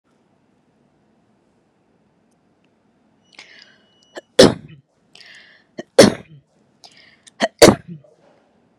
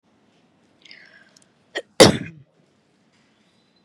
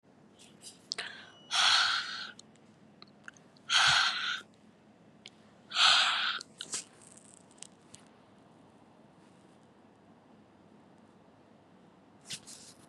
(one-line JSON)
{"three_cough_length": "8.8 s", "three_cough_amplitude": 32768, "three_cough_signal_mean_std_ratio": 0.19, "cough_length": "3.8 s", "cough_amplitude": 32768, "cough_signal_mean_std_ratio": 0.17, "exhalation_length": "12.9 s", "exhalation_amplitude": 9654, "exhalation_signal_mean_std_ratio": 0.36, "survey_phase": "beta (2021-08-13 to 2022-03-07)", "age": "18-44", "gender": "Female", "wearing_mask": "No", "symptom_none": true, "smoker_status": "Never smoked", "respiratory_condition_asthma": false, "respiratory_condition_other": false, "recruitment_source": "REACT", "submission_delay": "1 day", "covid_test_result": "Negative", "covid_test_method": "RT-qPCR"}